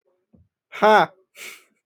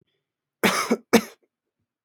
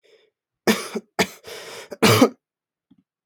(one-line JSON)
{"exhalation_length": "1.9 s", "exhalation_amplitude": 25744, "exhalation_signal_mean_std_ratio": 0.31, "cough_length": "2.0 s", "cough_amplitude": 29605, "cough_signal_mean_std_ratio": 0.31, "three_cough_length": "3.3 s", "three_cough_amplitude": 27989, "three_cough_signal_mean_std_ratio": 0.33, "survey_phase": "alpha (2021-03-01 to 2021-08-12)", "age": "18-44", "gender": "Male", "wearing_mask": "No", "symptom_fatigue": true, "smoker_status": "Never smoked", "respiratory_condition_asthma": false, "respiratory_condition_other": false, "recruitment_source": "Test and Trace", "submission_delay": "2 days", "covid_test_result": "Positive", "covid_test_method": "RT-qPCR"}